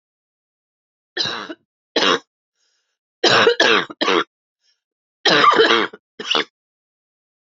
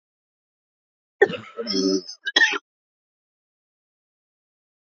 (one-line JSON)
{"three_cough_length": "7.6 s", "three_cough_amplitude": 31140, "three_cough_signal_mean_std_ratio": 0.41, "cough_length": "4.9 s", "cough_amplitude": 26963, "cough_signal_mean_std_ratio": 0.29, "survey_phase": "beta (2021-08-13 to 2022-03-07)", "age": "45-64", "gender": "Female", "wearing_mask": "No", "symptom_cough_any": true, "symptom_runny_or_blocked_nose": true, "symptom_headache": true, "symptom_other": true, "smoker_status": "Current smoker (11 or more cigarettes per day)", "respiratory_condition_asthma": false, "respiratory_condition_other": false, "recruitment_source": "Test and Trace", "submission_delay": "1 day", "covid_test_result": "Negative", "covid_test_method": "RT-qPCR"}